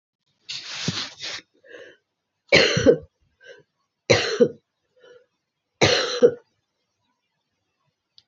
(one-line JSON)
{"three_cough_length": "8.3 s", "three_cough_amplitude": 26640, "three_cough_signal_mean_std_ratio": 0.32, "survey_phase": "beta (2021-08-13 to 2022-03-07)", "age": "45-64", "gender": "Female", "wearing_mask": "No", "symptom_cough_any": true, "symptom_runny_or_blocked_nose": true, "symptom_shortness_of_breath": true, "symptom_fatigue": true, "symptom_headache": true, "symptom_onset": "3 days", "smoker_status": "Never smoked", "respiratory_condition_asthma": false, "respiratory_condition_other": false, "recruitment_source": "Test and Trace", "submission_delay": "1 day", "covid_test_result": "Positive", "covid_test_method": "RT-qPCR", "covid_ct_value": 30.2, "covid_ct_gene": "ORF1ab gene"}